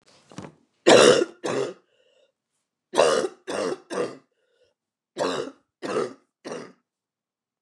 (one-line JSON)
{"three_cough_length": "7.6 s", "three_cough_amplitude": 26994, "three_cough_signal_mean_std_ratio": 0.35, "survey_phase": "beta (2021-08-13 to 2022-03-07)", "age": "45-64", "gender": "Female", "wearing_mask": "No", "symptom_cough_any": true, "symptom_new_continuous_cough": true, "symptom_runny_or_blocked_nose": true, "symptom_sore_throat": true, "symptom_abdominal_pain": true, "symptom_fatigue": true, "symptom_fever_high_temperature": true, "symptom_headache": true, "symptom_change_to_sense_of_smell_or_taste": true, "symptom_onset": "2 days", "smoker_status": "Never smoked", "respiratory_condition_asthma": false, "respiratory_condition_other": false, "recruitment_source": "Test and Trace", "submission_delay": "1 day", "covid_test_result": "Positive", "covid_test_method": "RT-qPCR", "covid_ct_value": 14.8, "covid_ct_gene": "ORF1ab gene", "covid_ct_mean": 15.0, "covid_viral_load": "12000000 copies/ml", "covid_viral_load_category": "High viral load (>1M copies/ml)"}